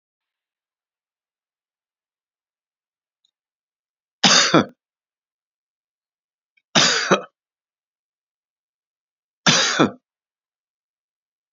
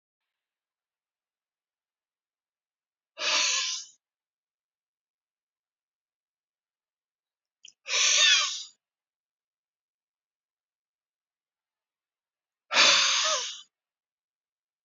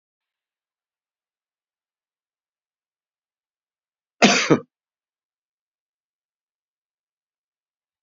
{"three_cough_length": "11.5 s", "three_cough_amplitude": 32394, "three_cough_signal_mean_std_ratio": 0.24, "exhalation_length": "14.8 s", "exhalation_amplitude": 14869, "exhalation_signal_mean_std_ratio": 0.28, "cough_length": "8.0 s", "cough_amplitude": 29716, "cough_signal_mean_std_ratio": 0.15, "survey_phase": "beta (2021-08-13 to 2022-03-07)", "age": "65+", "gender": "Male", "wearing_mask": "No", "symptom_none": true, "symptom_onset": "12 days", "smoker_status": "Never smoked", "respiratory_condition_asthma": false, "respiratory_condition_other": false, "recruitment_source": "REACT", "submission_delay": "1 day", "covid_test_result": "Negative", "covid_test_method": "RT-qPCR", "influenza_a_test_result": "Negative", "influenza_b_test_result": "Negative"}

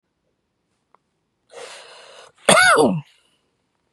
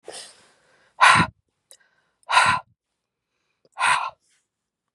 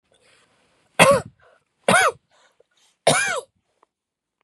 {"cough_length": "3.9 s", "cough_amplitude": 32767, "cough_signal_mean_std_ratio": 0.31, "exhalation_length": "4.9 s", "exhalation_amplitude": 28735, "exhalation_signal_mean_std_ratio": 0.32, "three_cough_length": "4.4 s", "three_cough_amplitude": 32767, "three_cough_signal_mean_std_ratio": 0.32, "survey_phase": "beta (2021-08-13 to 2022-03-07)", "age": "45-64", "gender": "Female", "wearing_mask": "No", "symptom_fatigue": true, "smoker_status": "Never smoked", "respiratory_condition_asthma": false, "respiratory_condition_other": false, "recruitment_source": "REACT", "submission_delay": "3 days", "covid_test_result": "Negative", "covid_test_method": "RT-qPCR", "influenza_a_test_result": "Negative", "influenza_b_test_result": "Negative"}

